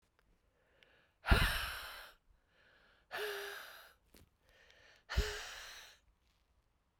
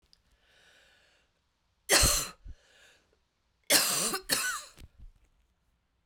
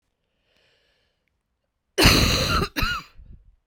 {"exhalation_length": "7.0 s", "exhalation_amplitude": 7057, "exhalation_signal_mean_std_ratio": 0.33, "three_cough_length": "6.1 s", "three_cough_amplitude": 14724, "three_cough_signal_mean_std_ratio": 0.35, "cough_length": "3.7 s", "cough_amplitude": 24451, "cough_signal_mean_std_ratio": 0.4, "survey_phase": "beta (2021-08-13 to 2022-03-07)", "age": "45-64", "gender": "Female", "wearing_mask": "No", "symptom_new_continuous_cough": true, "symptom_runny_or_blocked_nose": true, "symptom_sore_throat": true, "symptom_fatigue": true, "symptom_fever_high_temperature": true, "symptom_headache": true, "symptom_change_to_sense_of_smell_or_taste": true, "symptom_loss_of_taste": true, "symptom_onset": "2 days", "smoker_status": "Current smoker (e-cigarettes or vapes only)", "respiratory_condition_asthma": false, "respiratory_condition_other": false, "recruitment_source": "Test and Trace", "submission_delay": "1 day", "covid_test_result": "Positive", "covid_test_method": "RT-qPCR"}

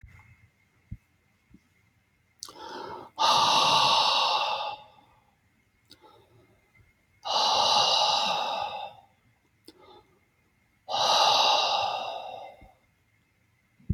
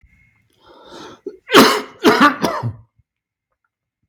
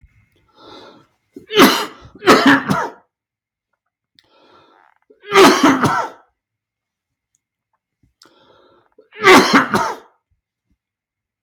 {"exhalation_length": "13.9 s", "exhalation_amplitude": 12277, "exhalation_signal_mean_std_ratio": 0.5, "cough_length": "4.1 s", "cough_amplitude": 32768, "cough_signal_mean_std_ratio": 0.36, "three_cough_length": "11.4 s", "three_cough_amplitude": 32768, "three_cough_signal_mean_std_ratio": 0.35, "survey_phase": "beta (2021-08-13 to 2022-03-07)", "age": "65+", "gender": "Male", "wearing_mask": "No", "symptom_none": true, "smoker_status": "Never smoked", "respiratory_condition_asthma": true, "respiratory_condition_other": false, "recruitment_source": "Test and Trace", "submission_delay": "1 day", "covid_test_result": "Negative", "covid_test_method": "LFT"}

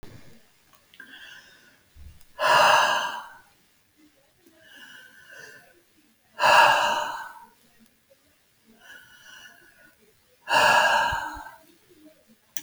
{"exhalation_length": "12.6 s", "exhalation_amplitude": 22790, "exhalation_signal_mean_std_ratio": 0.37, "survey_phase": "alpha (2021-03-01 to 2021-08-12)", "age": "65+", "gender": "Female", "wearing_mask": "No", "symptom_none": true, "smoker_status": "Never smoked", "respiratory_condition_asthma": false, "respiratory_condition_other": false, "recruitment_source": "REACT", "submission_delay": "1 day", "covid_test_result": "Negative", "covid_test_method": "RT-qPCR"}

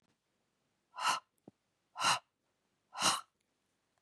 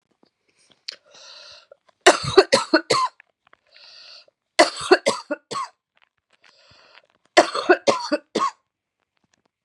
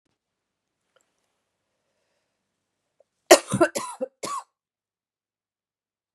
{"exhalation_length": "4.0 s", "exhalation_amplitude": 4910, "exhalation_signal_mean_std_ratio": 0.31, "three_cough_length": "9.6 s", "three_cough_amplitude": 32768, "three_cough_signal_mean_std_ratio": 0.3, "cough_length": "6.1 s", "cough_amplitude": 32767, "cough_signal_mean_std_ratio": 0.17, "survey_phase": "beta (2021-08-13 to 2022-03-07)", "age": "45-64", "gender": "Female", "wearing_mask": "No", "symptom_cough_any": true, "symptom_new_continuous_cough": true, "symptom_runny_or_blocked_nose": true, "symptom_fatigue": true, "symptom_change_to_sense_of_smell_or_taste": true, "smoker_status": "Ex-smoker", "respiratory_condition_asthma": false, "respiratory_condition_other": false, "recruitment_source": "Test and Trace", "submission_delay": "1 day", "covid_test_result": "Positive", "covid_test_method": "RT-qPCR"}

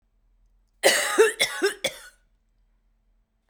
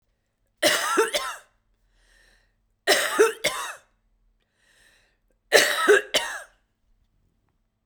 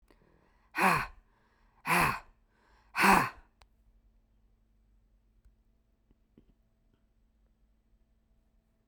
{"cough_length": "3.5 s", "cough_amplitude": 24997, "cough_signal_mean_std_ratio": 0.37, "three_cough_length": "7.9 s", "three_cough_amplitude": 29826, "three_cough_signal_mean_std_ratio": 0.37, "exhalation_length": "8.9 s", "exhalation_amplitude": 10679, "exhalation_signal_mean_std_ratio": 0.26, "survey_phase": "beta (2021-08-13 to 2022-03-07)", "age": "45-64", "gender": "Female", "wearing_mask": "No", "symptom_cough_any": true, "symptom_new_continuous_cough": true, "symptom_runny_or_blocked_nose": true, "symptom_shortness_of_breath": true, "symptom_sore_throat": true, "symptom_fatigue": true, "symptom_change_to_sense_of_smell_or_taste": true, "symptom_loss_of_taste": true, "symptom_other": true, "symptom_onset": "7 days", "smoker_status": "Never smoked", "respiratory_condition_asthma": false, "respiratory_condition_other": false, "recruitment_source": "Test and Trace", "submission_delay": "2 days", "covid_test_result": "Positive", "covid_test_method": "RT-qPCR", "covid_ct_value": 18.7, "covid_ct_gene": "ORF1ab gene", "covid_ct_mean": 18.9, "covid_viral_load": "640000 copies/ml", "covid_viral_load_category": "Low viral load (10K-1M copies/ml)"}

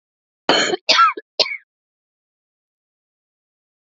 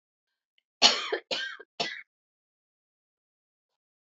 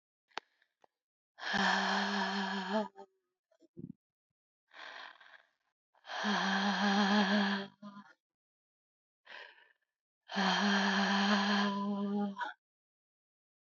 {"cough_length": "3.9 s", "cough_amplitude": 29966, "cough_signal_mean_std_ratio": 0.31, "three_cough_length": "4.1 s", "three_cough_amplitude": 25213, "three_cough_signal_mean_std_ratio": 0.25, "exhalation_length": "13.7 s", "exhalation_amplitude": 5220, "exhalation_signal_mean_std_ratio": 0.55, "survey_phase": "beta (2021-08-13 to 2022-03-07)", "age": "45-64", "gender": "Female", "wearing_mask": "No", "symptom_fatigue": true, "smoker_status": "Never smoked", "respiratory_condition_asthma": true, "respiratory_condition_other": false, "recruitment_source": "REACT", "submission_delay": "2 days", "covid_test_result": "Negative", "covid_test_method": "RT-qPCR", "influenza_a_test_result": "Negative", "influenza_b_test_result": "Negative"}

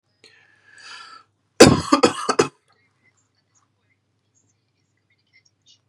{"cough_length": "5.9 s", "cough_amplitude": 32768, "cough_signal_mean_std_ratio": 0.22, "survey_phase": "beta (2021-08-13 to 2022-03-07)", "age": "18-44", "gender": "Male", "wearing_mask": "No", "symptom_none": true, "symptom_onset": "8 days", "smoker_status": "Ex-smoker", "respiratory_condition_asthma": false, "respiratory_condition_other": false, "recruitment_source": "Test and Trace", "submission_delay": "1 day", "covid_test_result": "Positive", "covid_test_method": "ePCR"}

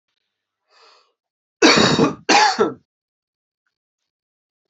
{"cough_length": "4.7 s", "cough_amplitude": 30686, "cough_signal_mean_std_ratio": 0.35, "survey_phase": "alpha (2021-03-01 to 2021-08-12)", "age": "45-64", "gender": "Male", "wearing_mask": "No", "symptom_cough_any": true, "symptom_fatigue": true, "symptom_change_to_sense_of_smell_or_taste": true, "symptom_onset": "7 days", "smoker_status": "Ex-smoker", "respiratory_condition_asthma": false, "respiratory_condition_other": false, "recruitment_source": "Test and Trace", "submission_delay": "1 day", "covid_test_result": "Positive", "covid_test_method": "RT-qPCR", "covid_ct_value": 24.4, "covid_ct_gene": "ORF1ab gene", "covid_ct_mean": 24.7, "covid_viral_load": "8100 copies/ml", "covid_viral_load_category": "Minimal viral load (< 10K copies/ml)"}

